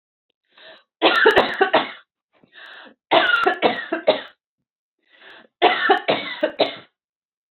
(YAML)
three_cough_length: 7.5 s
three_cough_amplitude: 28135
three_cough_signal_mean_std_ratio: 0.44
survey_phase: alpha (2021-03-01 to 2021-08-12)
age: 18-44
gender: Female
wearing_mask: 'No'
symptom_none: true
smoker_status: Never smoked
respiratory_condition_asthma: false
respiratory_condition_other: false
recruitment_source: REACT
submission_delay: 2 days
covid_test_result: Negative
covid_test_method: RT-qPCR